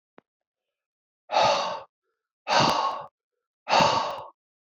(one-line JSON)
{"exhalation_length": "4.8 s", "exhalation_amplitude": 13875, "exhalation_signal_mean_std_ratio": 0.45, "survey_phase": "beta (2021-08-13 to 2022-03-07)", "age": "18-44", "gender": "Male", "wearing_mask": "No", "symptom_cough_any": true, "symptom_runny_or_blocked_nose": true, "symptom_shortness_of_breath": true, "symptom_fatigue": true, "symptom_fever_high_temperature": true, "symptom_headache": true, "smoker_status": "Never smoked", "respiratory_condition_asthma": false, "respiratory_condition_other": false, "recruitment_source": "Test and Trace", "submission_delay": "-1 day", "covid_test_result": "Positive", "covid_test_method": "LFT"}